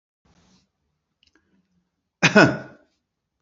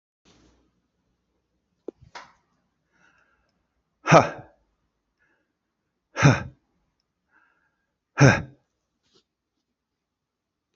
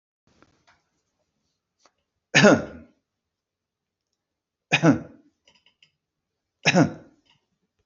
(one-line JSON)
{"cough_length": "3.4 s", "cough_amplitude": 28496, "cough_signal_mean_std_ratio": 0.22, "exhalation_length": "10.8 s", "exhalation_amplitude": 28975, "exhalation_signal_mean_std_ratio": 0.18, "three_cough_length": "7.9 s", "three_cough_amplitude": 27659, "three_cough_signal_mean_std_ratio": 0.24, "survey_phase": "beta (2021-08-13 to 2022-03-07)", "age": "45-64", "gender": "Male", "wearing_mask": "No", "symptom_none": true, "smoker_status": "Ex-smoker", "respiratory_condition_asthma": false, "respiratory_condition_other": false, "recruitment_source": "REACT", "submission_delay": "1 day", "covid_test_result": "Negative", "covid_test_method": "RT-qPCR"}